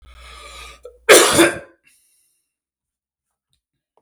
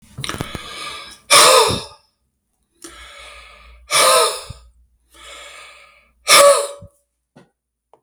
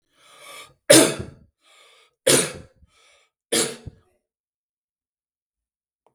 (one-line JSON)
{"cough_length": "4.0 s", "cough_amplitude": 32768, "cough_signal_mean_std_ratio": 0.28, "exhalation_length": "8.0 s", "exhalation_amplitude": 32768, "exhalation_signal_mean_std_ratio": 0.38, "three_cough_length": "6.1 s", "three_cough_amplitude": 32768, "three_cough_signal_mean_std_ratio": 0.25, "survey_phase": "beta (2021-08-13 to 2022-03-07)", "age": "45-64", "gender": "Male", "wearing_mask": "No", "symptom_none": true, "smoker_status": "Never smoked", "respiratory_condition_asthma": false, "respiratory_condition_other": false, "recruitment_source": "REACT", "submission_delay": "3 days", "covid_test_result": "Negative", "covid_test_method": "RT-qPCR", "influenza_a_test_result": "Negative", "influenza_b_test_result": "Negative"}